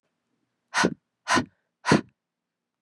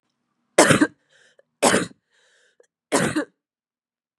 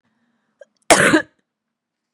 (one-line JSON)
{"exhalation_length": "2.8 s", "exhalation_amplitude": 18135, "exhalation_signal_mean_std_ratio": 0.31, "three_cough_length": "4.2 s", "three_cough_amplitude": 32768, "three_cough_signal_mean_std_ratio": 0.32, "cough_length": "2.1 s", "cough_amplitude": 32768, "cough_signal_mean_std_ratio": 0.29, "survey_phase": "beta (2021-08-13 to 2022-03-07)", "age": "18-44", "gender": "Female", "wearing_mask": "No", "symptom_runny_or_blocked_nose": true, "symptom_diarrhoea": true, "symptom_fatigue": true, "symptom_headache": true, "symptom_change_to_sense_of_smell_or_taste": true, "symptom_loss_of_taste": true, "symptom_onset": "8 days", "smoker_status": "Ex-smoker", "respiratory_condition_asthma": false, "respiratory_condition_other": false, "recruitment_source": "Test and Trace", "submission_delay": "3 days", "covid_test_result": "Positive", "covid_test_method": "RT-qPCR", "covid_ct_value": 17.2, "covid_ct_gene": "ORF1ab gene", "covid_ct_mean": 17.8, "covid_viral_load": "1500000 copies/ml", "covid_viral_load_category": "High viral load (>1M copies/ml)"}